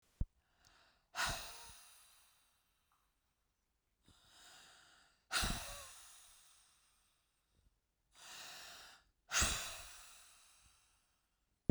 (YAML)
exhalation_length: 11.7 s
exhalation_amplitude: 4744
exhalation_signal_mean_std_ratio: 0.31
survey_phase: beta (2021-08-13 to 2022-03-07)
age: 45-64
gender: Female
wearing_mask: 'No'
symptom_runny_or_blocked_nose: true
symptom_onset: 8 days
smoker_status: Never smoked
respiratory_condition_asthma: false
respiratory_condition_other: false
recruitment_source: REACT
submission_delay: 1 day
covid_test_result: Negative
covid_test_method: RT-qPCR
influenza_a_test_result: Unknown/Void
influenza_b_test_result: Unknown/Void